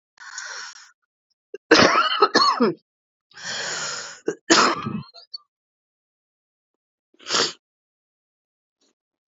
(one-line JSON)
{"cough_length": "9.3 s", "cough_amplitude": 30904, "cough_signal_mean_std_ratio": 0.36, "survey_phase": "beta (2021-08-13 to 2022-03-07)", "age": "18-44", "gender": "Female", "wearing_mask": "No", "symptom_cough_any": true, "symptom_runny_or_blocked_nose": true, "symptom_sore_throat": true, "symptom_fatigue": true, "symptom_headache": true, "symptom_onset": "2 days", "smoker_status": "Ex-smoker", "respiratory_condition_asthma": true, "respiratory_condition_other": false, "recruitment_source": "Test and Trace", "submission_delay": "1 day", "covid_test_result": "Positive", "covid_test_method": "RT-qPCR", "covid_ct_value": 21.7, "covid_ct_gene": "ORF1ab gene"}